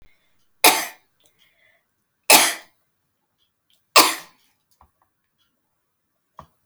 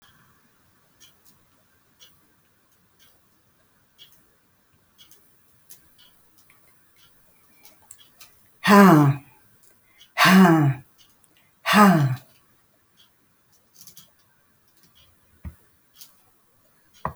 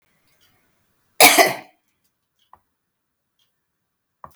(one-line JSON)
{"three_cough_length": "6.7 s", "three_cough_amplitude": 32768, "three_cough_signal_mean_std_ratio": 0.22, "exhalation_length": "17.2 s", "exhalation_amplitude": 27258, "exhalation_signal_mean_std_ratio": 0.26, "cough_length": "4.4 s", "cough_amplitude": 32768, "cough_signal_mean_std_ratio": 0.21, "survey_phase": "alpha (2021-03-01 to 2021-08-12)", "age": "65+", "gender": "Female", "wearing_mask": "No", "symptom_none": true, "smoker_status": "Never smoked", "respiratory_condition_asthma": false, "respiratory_condition_other": false, "recruitment_source": "REACT", "submission_delay": "1 day", "covid_test_result": "Negative", "covid_test_method": "RT-qPCR"}